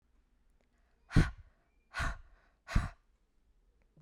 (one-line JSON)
{"exhalation_length": "4.0 s", "exhalation_amplitude": 7820, "exhalation_signal_mean_std_ratio": 0.26, "survey_phase": "beta (2021-08-13 to 2022-03-07)", "age": "18-44", "gender": "Female", "wearing_mask": "No", "symptom_cough_any": true, "symptom_sore_throat": true, "symptom_fatigue": true, "symptom_headache": true, "smoker_status": "Never smoked", "respiratory_condition_asthma": false, "respiratory_condition_other": false, "recruitment_source": "Test and Trace", "submission_delay": "1 day", "covid_test_result": "Positive", "covid_test_method": "LFT"}